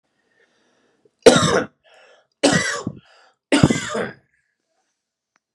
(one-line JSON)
{"three_cough_length": "5.5 s", "three_cough_amplitude": 32768, "three_cough_signal_mean_std_ratio": 0.33, "survey_phase": "beta (2021-08-13 to 2022-03-07)", "age": "18-44", "gender": "Male", "wearing_mask": "No", "symptom_none": true, "smoker_status": "Ex-smoker", "respiratory_condition_asthma": false, "respiratory_condition_other": false, "recruitment_source": "REACT", "submission_delay": "1 day", "covid_test_result": "Negative", "covid_test_method": "RT-qPCR"}